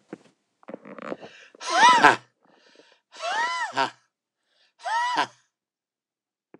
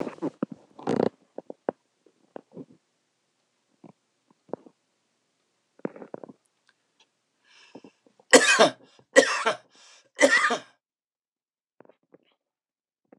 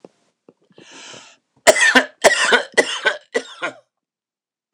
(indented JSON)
{
  "exhalation_length": "6.6 s",
  "exhalation_amplitude": 26027,
  "exhalation_signal_mean_std_ratio": 0.35,
  "three_cough_length": "13.2 s",
  "three_cough_amplitude": 26028,
  "three_cough_signal_mean_std_ratio": 0.24,
  "cough_length": "4.7 s",
  "cough_amplitude": 26028,
  "cough_signal_mean_std_ratio": 0.37,
  "survey_phase": "beta (2021-08-13 to 2022-03-07)",
  "age": "65+",
  "gender": "Male",
  "wearing_mask": "No",
  "symptom_none": true,
  "smoker_status": "Ex-smoker",
  "respiratory_condition_asthma": false,
  "respiratory_condition_other": false,
  "recruitment_source": "REACT",
  "submission_delay": "3 days",
  "covid_test_result": "Negative",
  "covid_test_method": "RT-qPCR",
  "influenza_a_test_result": "Negative",
  "influenza_b_test_result": "Negative"
}